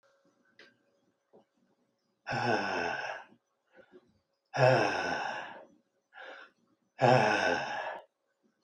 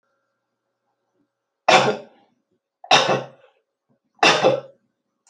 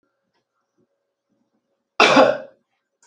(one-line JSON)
{"exhalation_length": "8.6 s", "exhalation_amplitude": 10438, "exhalation_signal_mean_std_ratio": 0.42, "three_cough_length": "5.3 s", "three_cough_amplitude": 31241, "three_cough_signal_mean_std_ratio": 0.32, "cough_length": "3.1 s", "cough_amplitude": 29380, "cough_signal_mean_std_ratio": 0.27, "survey_phase": "beta (2021-08-13 to 2022-03-07)", "age": "65+", "gender": "Male", "wearing_mask": "No", "symptom_runny_or_blocked_nose": true, "smoker_status": "Ex-smoker", "respiratory_condition_asthma": false, "respiratory_condition_other": false, "recruitment_source": "REACT", "submission_delay": "2 days", "covid_test_result": "Negative", "covid_test_method": "RT-qPCR"}